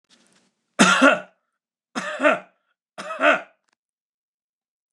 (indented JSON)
{
  "three_cough_length": "4.9 s",
  "three_cough_amplitude": 29058,
  "three_cough_signal_mean_std_ratio": 0.33,
  "survey_phase": "beta (2021-08-13 to 2022-03-07)",
  "age": "65+",
  "gender": "Male",
  "wearing_mask": "No",
  "symptom_none": true,
  "smoker_status": "Never smoked",
  "respiratory_condition_asthma": false,
  "respiratory_condition_other": false,
  "recruitment_source": "REACT",
  "submission_delay": "3 days",
  "covid_test_result": "Negative",
  "covid_test_method": "RT-qPCR",
  "influenza_a_test_result": "Negative",
  "influenza_b_test_result": "Negative"
}